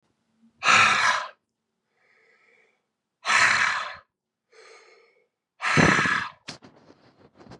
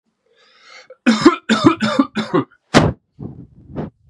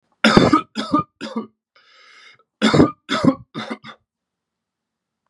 exhalation_length: 7.6 s
exhalation_amplitude: 21966
exhalation_signal_mean_std_ratio: 0.4
cough_length: 4.1 s
cough_amplitude: 32768
cough_signal_mean_std_ratio: 0.42
three_cough_length: 5.3 s
three_cough_amplitude: 32768
three_cough_signal_mean_std_ratio: 0.37
survey_phase: beta (2021-08-13 to 2022-03-07)
age: 18-44
gender: Male
wearing_mask: 'No'
symptom_cough_any: true
symptom_runny_or_blocked_nose: true
symptom_shortness_of_breath: true
symptom_headache: true
smoker_status: Never smoked
respiratory_condition_asthma: false
respiratory_condition_other: false
recruitment_source: Test and Trace
submission_delay: 1 day
covid_test_result: Negative
covid_test_method: ePCR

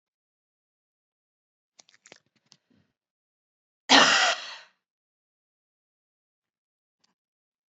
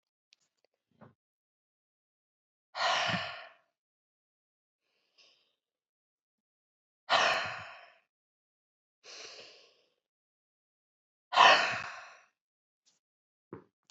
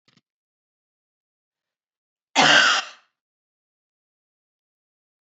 three_cough_length: 7.7 s
three_cough_amplitude: 23035
three_cough_signal_mean_std_ratio: 0.19
exhalation_length: 13.9 s
exhalation_amplitude: 13084
exhalation_signal_mean_std_ratio: 0.24
cough_length: 5.4 s
cough_amplitude: 24550
cough_signal_mean_std_ratio: 0.23
survey_phase: alpha (2021-03-01 to 2021-08-12)
age: 45-64
gender: Female
wearing_mask: 'No'
symptom_fatigue: true
symptom_fever_high_temperature: true
symptom_headache: true
symptom_change_to_sense_of_smell_or_taste: true
symptom_onset: 4 days
smoker_status: Ex-smoker
respiratory_condition_asthma: false
respiratory_condition_other: false
recruitment_source: Test and Trace
submission_delay: 2 days
covid_test_result: Positive
covid_test_method: RT-qPCR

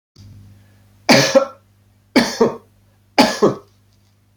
three_cough_length: 4.4 s
three_cough_amplitude: 32238
three_cough_signal_mean_std_ratio: 0.37
survey_phase: beta (2021-08-13 to 2022-03-07)
age: 45-64
gender: Male
wearing_mask: 'No'
symptom_sore_throat: true
symptom_onset: 12 days
smoker_status: Ex-smoker
respiratory_condition_asthma: false
respiratory_condition_other: false
recruitment_source: REACT
submission_delay: 5 days
covid_test_result: Negative
covid_test_method: RT-qPCR
influenza_a_test_result: Negative
influenza_b_test_result: Negative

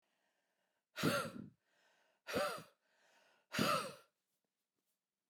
exhalation_length: 5.3 s
exhalation_amplitude: 3039
exhalation_signal_mean_std_ratio: 0.36
survey_phase: beta (2021-08-13 to 2022-03-07)
age: 45-64
gender: Female
wearing_mask: 'No'
symptom_cough_any: true
symptom_runny_or_blocked_nose: true
symptom_shortness_of_breath: true
symptom_onset: 9 days
smoker_status: Never smoked
respiratory_condition_asthma: true
respiratory_condition_other: false
recruitment_source: REACT
submission_delay: 1 day
covid_test_result: Negative
covid_test_method: RT-qPCR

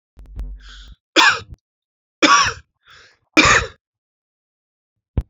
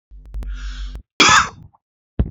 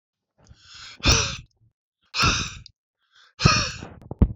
three_cough_length: 5.3 s
three_cough_amplitude: 30041
three_cough_signal_mean_std_ratio: 0.34
cough_length: 2.3 s
cough_amplitude: 28632
cough_signal_mean_std_ratio: 0.44
exhalation_length: 4.4 s
exhalation_amplitude: 26376
exhalation_signal_mean_std_ratio: 0.38
survey_phase: alpha (2021-03-01 to 2021-08-12)
age: 18-44
gender: Male
wearing_mask: 'No'
symptom_cough_any: true
symptom_fatigue: true
symptom_headache: true
symptom_change_to_sense_of_smell_or_taste: true
symptom_loss_of_taste: true
symptom_onset: 5 days
smoker_status: Never smoked
respiratory_condition_asthma: false
respiratory_condition_other: false
recruitment_source: Test and Trace
submission_delay: 2 days
covid_test_result: Positive
covid_test_method: ePCR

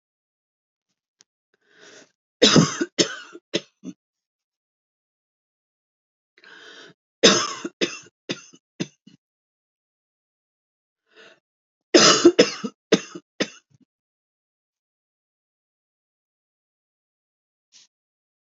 three_cough_length: 18.5 s
three_cough_amplitude: 32664
three_cough_signal_mean_std_ratio: 0.21
survey_phase: beta (2021-08-13 to 2022-03-07)
age: 45-64
gender: Female
wearing_mask: 'No'
symptom_none: true
smoker_status: Never smoked
respiratory_condition_asthma: true
respiratory_condition_other: false
recruitment_source: REACT
submission_delay: 3 days
covid_test_result: Negative
covid_test_method: RT-qPCR
influenza_a_test_result: Unknown/Void
influenza_b_test_result: Unknown/Void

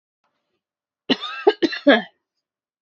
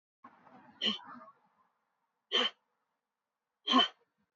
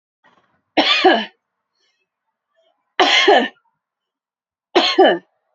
cough_length: 2.8 s
cough_amplitude: 27500
cough_signal_mean_std_ratio: 0.29
exhalation_length: 4.4 s
exhalation_amplitude: 6688
exhalation_signal_mean_std_ratio: 0.29
three_cough_length: 5.5 s
three_cough_amplitude: 29404
three_cough_signal_mean_std_ratio: 0.39
survey_phase: beta (2021-08-13 to 2022-03-07)
age: 18-44
gender: Female
wearing_mask: 'No'
symptom_fatigue: true
symptom_onset: 12 days
smoker_status: Ex-smoker
respiratory_condition_asthma: true
respiratory_condition_other: false
recruitment_source: REACT
submission_delay: 1 day
covid_test_result: Negative
covid_test_method: RT-qPCR
influenza_a_test_result: Negative
influenza_b_test_result: Negative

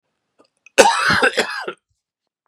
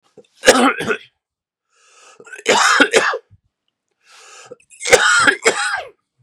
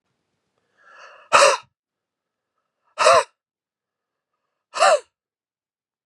cough_length: 2.5 s
cough_amplitude: 32768
cough_signal_mean_std_ratio: 0.41
three_cough_length: 6.2 s
three_cough_amplitude: 32768
three_cough_signal_mean_std_ratio: 0.45
exhalation_length: 6.1 s
exhalation_amplitude: 31044
exhalation_signal_mean_std_ratio: 0.27
survey_phase: beta (2021-08-13 to 2022-03-07)
age: 45-64
gender: Male
wearing_mask: 'No'
symptom_cough_any: true
symptom_sore_throat: true
symptom_headache: true
smoker_status: Never smoked
respiratory_condition_asthma: false
respiratory_condition_other: false
recruitment_source: Test and Trace
submission_delay: 2 days
covid_test_result: Positive
covid_test_method: RT-qPCR
covid_ct_value: 19.6
covid_ct_gene: ORF1ab gene
covid_ct_mean: 20.0
covid_viral_load: 280000 copies/ml
covid_viral_load_category: Low viral load (10K-1M copies/ml)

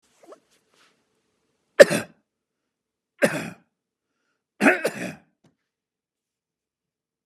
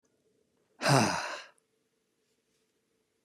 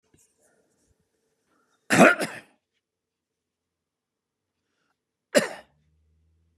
three_cough_length: 7.3 s
three_cough_amplitude: 32768
three_cough_signal_mean_std_ratio: 0.18
exhalation_length: 3.2 s
exhalation_amplitude: 10088
exhalation_signal_mean_std_ratio: 0.3
cough_length: 6.6 s
cough_amplitude: 26713
cough_signal_mean_std_ratio: 0.19
survey_phase: beta (2021-08-13 to 2022-03-07)
age: 65+
gender: Male
wearing_mask: 'No'
symptom_none: true
smoker_status: Never smoked
respiratory_condition_asthma: false
respiratory_condition_other: false
recruitment_source: REACT
submission_delay: 2 days
covid_test_result: Negative
covid_test_method: RT-qPCR
influenza_a_test_result: Negative
influenza_b_test_result: Negative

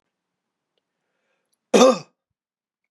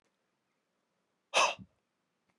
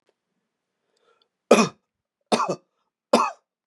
cough_length: 2.9 s
cough_amplitude: 29469
cough_signal_mean_std_ratio: 0.22
exhalation_length: 2.4 s
exhalation_amplitude: 6344
exhalation_signal_mean_std_ratio: 0.23
three_cough_length: 3.7 s
three_cough_amplitude: 30175
three_cough_signal_mean_std_ratio: 0.27
survey_phase: beta (2021-08-13 to 2022-03-07)
age: 45-64
gender: Male
wearing_mask: 'No'
symptom_none: true
smoker_status: Never smoked
respiratory_condition_asthma: false
respiratory_condition_other: false
recruitment_source: REACT
submission_delay: 2 days
covid_test_result: Negative
covid_test_method: RT-qPCR
influenza_a_test_result: Negative
influenza_b_test_result: Negative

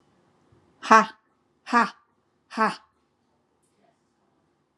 exhalation_length: 4.8 s
exhalation_amplitude: 31932
exhalation_signal_mean_std_ratio: 0.22
survey_phase: alpha (2021-03-01 to 2021-08-12)
age: 45-64
gender: Female
wearing_mask: 'Yes'
symptom_none: true
smoker_status: Ex-smoker
respiratory_condition_asthma: false
respiratory_condition_other: false
recruitment_source: Test and Trace
submission_delay: 0 days
covid_test_result: Negative
covid_test_method: LFT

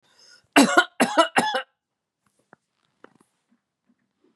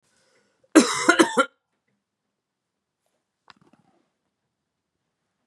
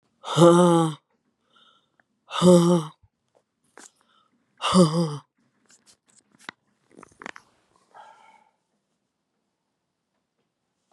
three_cough_length: 4.4 s
three_cough_amplitude: 29561
three_cough_signal_mean_std_ratio: 0.29
cough_length: 5.5 s
cough_amplitude: 31240
cough_signal_mean_std_ratio: 0.22
exhalation_length: 10.9 s
exhalation_amplitude: 26991
exhalation_signal_mean_std_ratio: 0.29
survey_phase: beta (2021-08-13 to 2022-03-07)
age: 45-64
gender: Female
wearing_mask: 'No'
symptom_cough_any: true
symptom_runny_or_blocked_nose: true
symptom_sore_throat: true
symptom_onset: 4 days
smoker_status: Never smoked
respiratory_condition_asthma: false
respiratory_condition_other: false
recruitment_source: REACT
submission_delay: 2 days
covid_test_result: Negative
covid_test_method: RT-qPCR
influenza_a_test_result: Negative
influenza_b_test_result: Negative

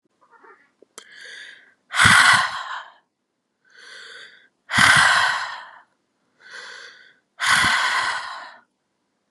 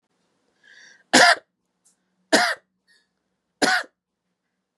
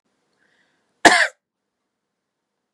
exhalation_length: 9.3 s
exhalation_amplitude: 32664
exhalation_signal_mean_std_ratio: 0.42
three_cough_length: 4.8 s
three_cough_amplitude: 29501
three_cough_signal_mean_std_ratio: 0.28
cough_length: 2.7 s
cough_amplitude: 32768
cough_signal_mean_std_ratio: 0.21
survey_phase: beta (2021-08-13 to 2022-03-07)
age: 18-44
gender: Female
wearing_mask: 'No'
symptom_abdominal_pain: true
symptom_headache: true
symptom_other: true
smoker_status: Never smoked
respiratory_condition_asthma: false
respiratory_condition_other: false
recruitment_source: REACT
submission_delay: 2 days
covid_test_result: Negative
covid_test_method: RT-qPCR
influenza_a_test_result: Unknown/Void
influenza_b_test_result: Unknown/Void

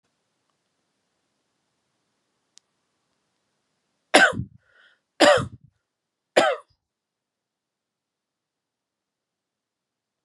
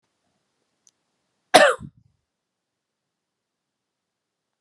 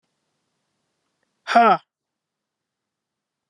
three_cough_length: 10.2 s
three_cough_amplitude: 31969
three_cough_signal_mean_std_ratio: 0.19
cough_length: 4.6 s
cough_amplitude: 32767
cough_signal_mean_std_ratio: 0.16
exhalation_length: 3.5 s
exhalation_amplitude: 27715
exhalation_signal_mean_std_ratio: 0.22
survey_phase: beta (2021-08-13 to 2022-03-07)
age: 18-44
gender: Female
wearing_mask: 'No'
symptom_fatigue: true
symptom_headache: true
smoker_status: Never smoked
respiratory_condition_asthma: false
respiratory_condition_other: false
recruitment_source: REACT
submission_delay: 5 days
covid_test_result: Negative
covid_test_method: RT-qPCR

